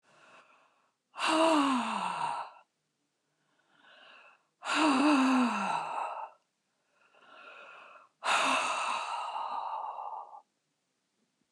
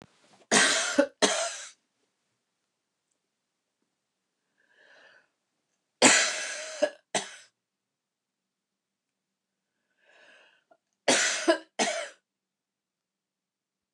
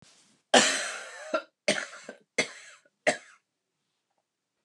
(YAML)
exhalation_length: 11.5 s
exhalation_amplitude: 6070
exhalation_signal_mean_std_ratio: 0.54
three_cough_length: 13.9 s
three_cough_amplitude: 19077
three_cough_signal_mean_std_ratio: 0.3
cough_length: 4.6 s
cough_amplitude: 21710
cough_signal_mean_std_ratio: 0.31
survey_phase: beta (2021-08-13 to 2022-03-07)
age: 65+
gender: Female
wearing_mask: 'No'
symptom_fatigue: true
smoker_status: Ex-smoker
respiratory_condition_asthma: false
respiratory_condition_other: false
recruitment_source: REACT
submission_delay: 1 day
covid_test_result: Negative
covid_test_method: RT-qPCR
influenza_a_test_result: Negative
influenza_b_test_result: Negative